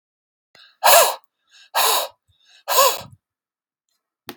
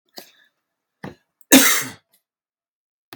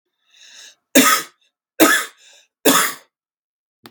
{
  "exhalation_length": "4.4 s",
  "exhalation_amplitude": 32768,
  "exhalation_signal_mean_std_ratio": 0.35,
  "cough_length": "3.2 s",
  "cough_amplitude": 32768,
  "cough_signal_mean_std_ratio": 0.25,
  "three_cough_length": "3.9 s",
  "three_cough_amplitude": 32768,
  "three_cough_signal_mean_std_ratio": 0.36,
  "survey_phase": "beta (2021-08-13 to 2022-03-07)",
  "age": "18-44",
  "gender": "Male",
  "wearing_mask": "No",
  "symptom_runny_or_blocked_nose": true,
  "symptom_onset": "9 days",
  "smoker_status": "Ex-smoker",
  "respiratory_condition_asthma": false,
  "respiratory_condition_other": false,
  "recruitment_source": "REACT",
  "submission_delay": "1 day",
  "covid_test_result": "Negative",
  "covid_test_method": "RT-qPCR",
  "influenza_a_test_result": "Unknown/Void",
  "influenza_b_test_result": "Unknown/Void"
}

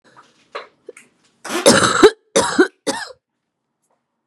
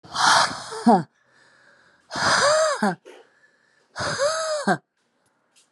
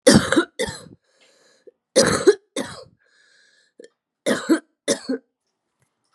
{
  "cough_length": "4.3 s",
  "cough_amplitude": 32768,
  "cough_signal_mean_std_ratio": 0.35,
  "exhalation_length": "5.7 s",
  "exhalation_amplitude": 22908,
  "exhalation_signal_mean_std_ratio": 0.51,
  "three_cough_length": "6.1 s",
  "three_cough_amplitude": 31451,
  "three_cough_signal_mean_std_ratio": 0.34,
  "survey_phase": "beta (2021-08-13 to 2022-03-07)",
  "age": "18-44",
  "gender": "Female",
  "wearing_mask": "No",
  "symptom_cough_any": true,
  "symptom_runny_or_blocked_nose": true,
  "symptom_sore_throat": true,
  "symptom_abdominal_pain": true,
  "symptom_headache": true,
  "symptom_change_to_sense_of_smell_or_taste": true,
  "symptom_onset": "6 days",
  "smoker_status": "Current smoker (11 or more cigarettes per day)",
  "respiratory_condition_asthma": false,
  "respiratory_condition_other": false,
  "recruitment_source": "Test and Trace",
  "submission_delay": "2 days",
  "covid_test_result": "Positive",
  "covid_test_method": "RT-qPCR"
}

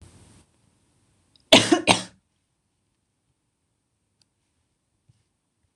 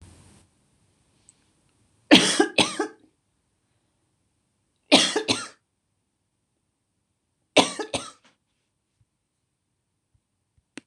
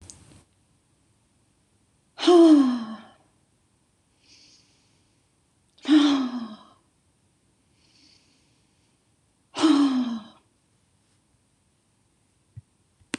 {
  "cough_length": "5.8 s",
  "cough_amplitude": 26028,
  "cough_signal_mean_std_ratio": 0.18,
  "three_cough_length": "10.9 s",
  "three_cough_amplitude": 26028,
  "three_cough_signal_mean_std_ratio": 0.23,
  "exhalation_length": "13.2 s",
  "exhalation_amplitude": 15851,
  "exhalation_signal_mean_std_ratio": 0.3,
  "survey_phase": "beta (2021-08-13 to 2022-03-07)",
  "age": "45-64",
  "gender": "Female",
  "wearing_mask": "No",
  "symptom_none": true,
  "symptom_onset": "4 days",
  "smoker_status": "Never smoked",
  "respiratory_condition_asthma": false,
  "respiratory_condition_other": false,
  "recruitment_source": "REACT",
  "submission_delay": "1 day",
  "covid_test_result": "Negative",
  "covid_test_method": "RT-qPCR"
}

